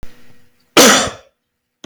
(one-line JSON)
{"cough_length": "1.9 s", "cough_amplitude": 32768, "cough_signal_mean_std_ratio": 0.39, "survey_phase": "beta (2021-08-13 to 2022-03-07)", "age": "45-64", "gender": "Male", "wearing_mask": "No", "symptom_none": true, "smoker_status": "Never smoked", "respiratory_condition_asthma": false, "respiratory_condition_other": false, "recruitment_source": "REACT", "submission_delay": "0 days", "covid_test_result": "Negative", "covid_test_method": "RT-qPCR", "influenza_a_test_result": "Negative", "influenza_b_test_result": "Negative"}